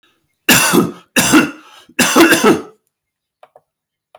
three_cough_length: 4.2 s
three_cough_amplitude: 32768
three_cough_signal_mean_std_ratio: 0.48
survey_phase: beta (2021-08-13 to 2022-03-07)
age: 18-44
gender: Male
wearing_mask: 'No'
symptom_none: true
smoker_status: Never smoked
respiratory_condition_asthma: false
respiratory_condition_other: false
recruitment_source: REACT
submission_delay: 1 day
covid_test_result: Negative
covid_test_method: RT-qPCR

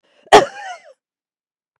cough_length: 1.8 s
cough_amplitude: 32768
cough_signal_mean_std_ratio: 0.23
survey_phase: beta (2021-08-13 to 2022-03-07)
age: 45-64
gender: Female
wearing_mask: 'No'
symptom_none: true
smoker_status: Never smoked
respiratory_condition_asthma: false
respiratory_condition_other: false
recruitment_source: REACT
submission_delay: 1 day
covid_test_result: Negative
covid_test_method: RT-qPCR
influenza_a_test_result: Negative
influenza_b_test_result: Negative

